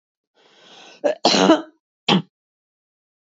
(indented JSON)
{
  "cough_length": "3.2 s",
  "cough_amplitude": 29598,
  "cough_signal_mean_std_ratio": 0.33,
  "survey_phase": "beta (2021-08-13 to 2022-03-07)",
  "age": "65+",
  "gender": "Female",
  "wearing_mask": "No",
  "symptom_none": true,
  "symptom_onset": "5 days",
  "smoker_status": "Ex-smoker",
  "respiratory_condition_asthma": false,
  "respiratory_condition_other": false,
  "recruitment_source": "Test and Trace",
  "submission_delay": "1 day",
  "covid_test_result": "Positive",
  "covid_test_method": "RT-qPCR",
  "covid_ct_value": 23.6,
  "covid_ct_gene": "N gene",
  "covid_ct_mean": 23.7,
  "covid_viral_load": "17000 copies/ml",
  "covid_viral_load_category": "Low viral load (10K-1M copies/ml)"
}